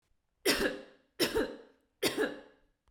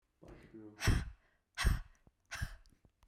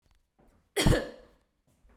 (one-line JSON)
{"three_cough_length": "2.9 s", "three_cough_amplitude": 7141, "three_cough_signal_mean_std_ratio": 0.47, "exhalation_length": "3.1 s", "exhalation_amplitude": 4097, "exhalation_signal_mean_std_ratio": 0.37, "cough_length": "2.0 s", "cough_amplitude": 9795, "cough_signal_mean_std_ratio": 0.3, "survey_phase": "beta (2021-08-13 to 2022-03-07)", "age": "18-44", "gender": "Female", "wearing_mask": "No", "symptom_none": true, "smoker_status": "Never smoked", "respiratory_condition_asthma": false, "respiratory_condition_other": false, "recruitment_source": "REACT", "submission_delay": "2 days", "covid_test_result": "Negative", "covid_test_method": "RT-qPCR"}